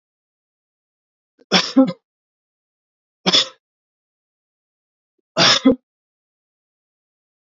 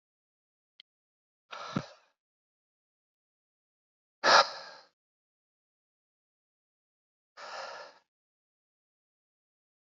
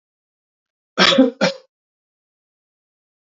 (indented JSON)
{
  "three_cough_length": "7.4 s",
  "three_cough_amplitude": 32692,
  "three_cough_signal_mean_std_ratio": 0.25,
  "exhalation_length": "9.9 s",
  "exhalation_amplitude": 13585,
  "exhalation_signal_mean_std_ratio": 0.16,
  "cough_length": "3.3 s",
  "cough_amplitude": 28677,
  "cough_signal_mean_std_ratio": 0.28,
  "survey_phase": "beta (2021-08-13 to 2022-03-07)",
  "age": "45-64",
  "gender": "Male",
  "wearing_mask": "No",
  "symptom_none": true,
  "smoker_status": "Never smoked",
  "respiratory_condition_asthma": false,
  "respiratory_condition_other": false,
  "recruitment_source": "REACT",
  "submission_delay": "1 day",
  "covid_test_result": "Negative",
  "covid_test_method": "RT-qPCR",
  "influenza_a_test_result": "Negative",
  "influenza_b_test_result": "Negative"
}